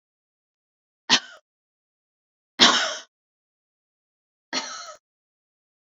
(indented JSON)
{
  "three_cough_length": "5.9 s",
  "three_cough_amplitude": 29345,
  "three_cough_signal_mean_std_ratio": 0.22,
  "survey_phase": "beta (2021-08-13 to 2022-03-07)",
  "age": "45-64",
  "gender": "Female",
  "wearing_mask": "No",
  "symptom_none": true,
  "smoker_status": "Never smoked",
  "respiratory_condition_asthma": false,
  "respiratory_condition_other": false,
  "recruitment_source": "REACT",
  "submission_delay": "2 days",
  "covid_test_result": "Negative",
  "covid_test_method": "RT-qPCR"
}